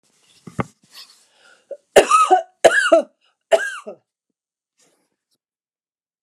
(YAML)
three_cough_length: 6.2 s
three_cough_amplitude: 29204
three_cough_signal_mean_std_ratio: 0.31
survey_phase: alpha (2021-03-01 to 2021-08-12)
age: 65+
gender: Female
wearing_mask: 'No'
symptom_none: true
smoker_status: Ex-smoker
respiratory_condition_asthma: true
respiratory_condition_other: false
recruitment_source: REACT
submission_delay: 2 days
covid_test_result: Negative
covid_test_method: RT-qPCR